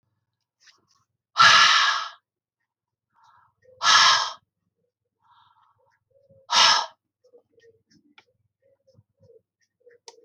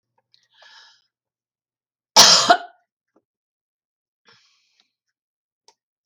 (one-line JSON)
{"exhalation_length": "10.2 s", "exhalation_amplitude": 23705, "exhalation_signal_mean_std_ratio": 0.3, "cough_length": "6.1 s", "cough_amplitude": 32768, "cough_signal_mean_std_ratio": 0.2, "survey_phase": "alpha (2021-03-01 to 2021-08-12)", "age": "65+", "gender": "Female", "wearing_mask": "No", "symptom_none": true, "smoker_status": "Never smoked", "respiratory_condition_asthma": false, "respiratory_condition_other": false, "recruitment_source": "REACT", "submission_delay": "2 days", "covid_test_result": "Negative", "covid_test_method": "RT-qPCR"}